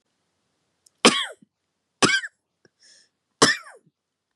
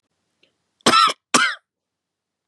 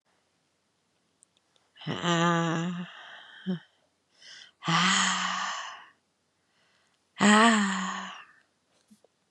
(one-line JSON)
{"three_cough_length": "4.4 s", "three_cough_amplitude": 30813, "three_cough_signal_mean_std_ratio": 0.25, "cough_length": "2.5 s", "cough_amplitude": 30772, "cough_signal_mean_std_ratio": 0.34, "exhalation_length": "9.3 s", "exhalation_amplitude": 16558, "exhalation_signal_mean_std_ratio": 0.43, "survey_phase": "beta (2021-08-13 to 2022-03-07)", "age": "45-64", "gender": "Female", "wearing_mask": "No", "symptom_diarrhoea": true, "symptom_other": true, "symptom_onset": "9 days", "smoker_status": "Never smoked", "respiratory_condition_asthma": false, "respiratory_condition_other": false, "recruitment_source": "Test and Trace", "submission_delay": "4 days", "covid_test_result": "Negative", "covid_test_method": "RT-qPCR"}